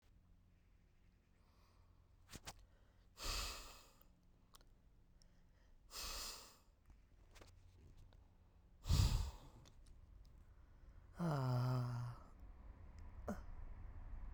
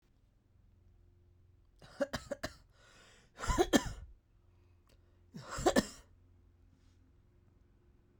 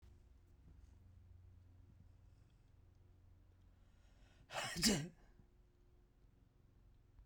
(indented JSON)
{
  "exhalation_length": "14.3 s",
  "exhalation_amplitude": 2671,
  "exhalation_signal_mean_std_ratio": 0.45,
  "three_cough_length": "8.2 s",
  "three_cough_amplitude": 8579,
  "three_cough_signal_mean_std_ratio": 0.27,
  "cough_length": "7.3 s",
  "cough_amplitude": 2970,
  "cough_signal_mean_std_ratio": 0.31,
  "survey_phase": "alpha (2021-03-01 to 2021-08-12)",
  "age": "18-44",
  "gender": "Male",
  "wearing_mask": "No",
  "symptom_cough_any": true,
  "symptom_diarrhoea": true,
  "symptom_fatigue": true,
  "symptom_headache": true,
  "symptom_onset": "2 days",
  "smoker_status": "Never smoked",
  "respiratory_condition_asthma": false,
  "respiratory_condition_other": false,
  "recruitment_source": "Test and Trace",
  "submission_delay": "2 days",
  "covid_test_result": "Positive",
  "covid_test_method": "RT-qPCR",
  "covid_ct_value": 18.0,
  "covid_ct_gene": "ORF1ab gene",
  "covid_ct_mean": 18.8,
  "covid_viral_load": "690000 copies/ml",
  "covid_viral_load_category": "Low viral load (10K-1M copies/ml)"
}